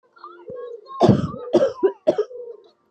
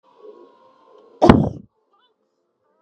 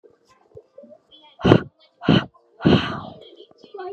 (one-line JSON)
{"three_cough_length": "2.9 s", "three_cough_amplitude": 28186, "three_cough_signal_mean_std_ratio": 0.46, "cough_length": "2.8 s", "cough_amplitude": 32768, "cough_signal_mean_std_ratio": 0.23, "exhalation_length": "3.9 s", "exhalation_amplitude": 32768, "exhalation_signal_mean_std_ratio": 0.33, "survey_phase": "beta (2021-08-13 to 2022-03-07)", "age": "18-44", "gender": "Female", "wearing_mask": "No", "symptom_cough_any": true, "smoker_status": "Never smoked", "respiratory_condition_asthma": false, "respiratory_condition_other": false, "recruitment_source": "REACT", "submission_delay": "1 day", "covid_test_result": "Negative", "covid_test_method": "RT-qPCR", "influenza_a_test_result": "Negative", "influenza_b_test_result": "Negative"}